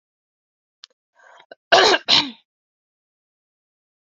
{"cough_length": "4.2 s", "cough_amplitude": 31821, "cough_signal_mean_std_ratio": 0.25, "survey_phase": "beta (2021-08-13 to 2022-03-07)", "age": "18-44", "gender": "Female", "wearing_mask": "No", "symptom_cough_any": true, "symptom_runny_or_blocked_nose": true, "symptom_sore_throat": true, "smoker_status": "Never smoked", "respiratory_condition_asthma": false, "respiratory_condition_other": false, "recruitment_source": "Test and Trace", "submission_delay": "2 days", "covid_test_result": "Positive", "covid_test_method": "RT-qPCR", "covid_ct_value": 18.0, "covid_ct_gene": "ORF1ab gene"}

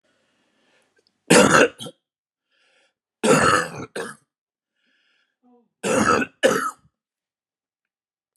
{"three_cough_length": "8.4 s", "three_cough_amplitude": 32018, "three_cough_signal_mean_std_ratio": 0.34, "survey_phase": "beta (2021-08-13 to 2022-03-07)", "age": "65+", "gender": "Male", "wearing_mask": "No", "symptom_cough_any": true, "symptom_runny_or_blocked_nose": true, "symptom_diarrhoea": true, "symptom_fatigue": true, "symptom_headache": true, "smoker_status": "Ex-smoker", "respiratory_condition_asthma": false, "respiratory_condition_other": false, "recruitment_source": "Test and Trace", "submission_delay": "1 day", "covid_test_result": "Positive", "covid_test_method": "RT-qPCR", "covid_ct_value": 23.2, "covid_ct_gene": "ORF1ab gene", "covid_ct_mean": 24.0, "covid_viral_load": "14000 copies/ml", "covid_viral_load_category": "Low viral load (10K-1M copies/ml)"}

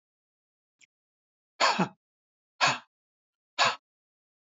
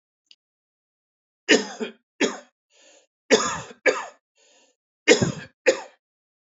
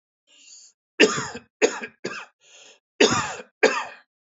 {"exhalation_length": "4.4 s", "exhalation_amplitude": 11436, "exhalation_signal_mean_std_ratio": 0.28, "three_cough_length": "6.6 s", "three_cough_amplitude": 26611, "three_cough_signal_mean_std_ratio": 0.3, "cough_length": "4.3 s", "cough_amplitude": 26579, "cough_signal_mean_std_ratio": 0.35, "survey_phase": "alpha (2021-03-01 to 2021-08-12)", "age": "65+", "gender": "Male", "wearing_mask": "No", "symptom_none": true, "smoker_status": "Never smoked", "respiratory_condition_asthma": false, "respiratory_condition_other": false, "recruitment_source": "REACT", "submission_delay": "2 days", "covid_test_result": "Negative", "covid_test_method": "RT-qPCR"}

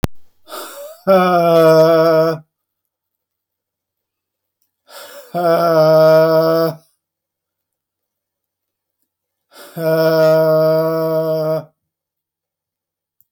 {"exhalation_length": "13.3 s", "exhalation_amplitude": 32768, "exhalation_signal_mean_std_ratio": 0.55, "survey_phase": "beta (2021-08-13 to 2022-03-07)", "age": "65+", "gender": "Male", "wearing_mask": "No", "symptom_none": true, "smoker_status": "Ex-smoker", "respiratory_condition_asthma": true, "respiratory_condition_other": false, "recruitment_source": "REACT", "submission_delay": "2 days", "covid_test_result": "Negative", "covid_test_method": "RT-qPCR"}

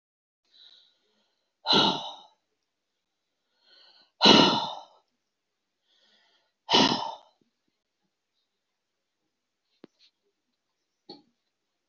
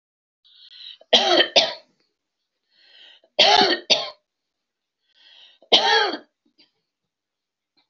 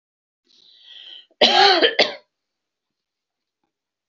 {"exhalation_length": "11.9 s", "exhalation_amplitude": 24205, "exhalation_signal_mean_std_ratio": 0.24, "three_cough_length": "7.9 s", "three_cough_amplitude": 28512, "three_cough_signal_mean_std_ratio": 0.34, "cough_length": "4.1 s", "cough_amplitude": 32767, "cough_signal_mean_std_ratio": 0.32, "survey_phase": "beta (2021-08-13 to 2022-03-07)", "age": "65+", "gender": "Female", "wearing_mask": "No", "symptom_none": true, "smoker_status": "Never smoked", "respiratory_condition_asthma": false, "respiratory_condition_other": false, "recruitment_source": "REACT", "submission_delay": "5 days", "covid_test_result": "Negative", "covid_test_method": "RT-qPCR", "influenza_a_test_result": "Negative", "influenza_b_test_result": "Negative"}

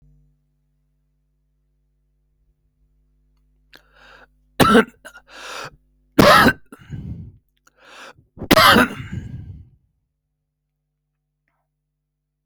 {"three_cough_length": "12.5 s", "three_cough_amplitude": 32768, "three_cough_signal_mean_std_ratio": 0.26, "survey_phase": "alpha (2021-03-01 to 2021-08-12)", "age": "65+", "gender": "Male", "wearing_mask": "No", "symptom_cough_any": true, "symptom_shortness_of_breath": true, "smoker_status": "Ex-smoker", "respiratory_condition_asthma": false, "respiratory_condition_other": false, "recruitment_source": "REACT", "submission_delay": "22 days", "covid_test_result": "Negative", "covid_test_method": "RT-qPCR"}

